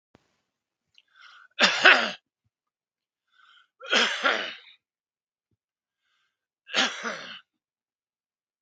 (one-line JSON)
{"three_cough_length": "8.6 s", "three_cough_amplitude": 32768, "three_cough_signal_mean_std_ratio": 0.27, "survey_phase": "beta (2021-08-13 to 2022-03-07)", "age": "65+", "gender": "Male", "wearing_mask": "No", "symptom_none": true, "smoker_status": "Never smoked", "respiratory_condition_asthma": false, "respiratory_condition_other": false, "recruitment_source": "REACT", "submission_delay": "2 days", "covid_test_result": "Negative", "covid_test_method": "RT-qPCR", "influenza_a_test_result": "Negative", "influenza_b_test_result": "Negative"}